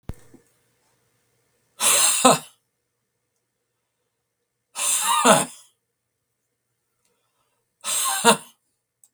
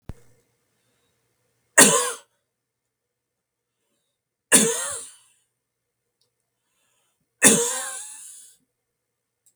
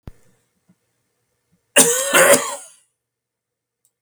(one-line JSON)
{"exhalation_length": "9.1 s", "exhalation_amplitude": 32768, "exhalation_signal_mean_std_ratio": 0.33, "three_cough_length": "9.6 s", "three_cough_amplitude": 32768, "three_cough_signal_mean_std_ratio": 0.25, "cough_length": "4.0 s", "cough_amplitude": 32768, "cough_signal_mean_std_ratio": 0.32, "survey_phase": "beta (2021-08-13 to 2022-03-07)", "age": "65+", "gender": "Male", "wearing_mask": "No", "symptom_none": true, "smoker_status": "Never smoked", "respiratory_condition_asthma": false, "respiratory_condition_other": false, "recruitment_source": "REACT", "submission_delay": "5 days", "covid_test_result": "Negative", "covid_test_method": "RT-qPCR", "influenza_a_test_result": "Negative", "influenza_b_test_result": "Negative"}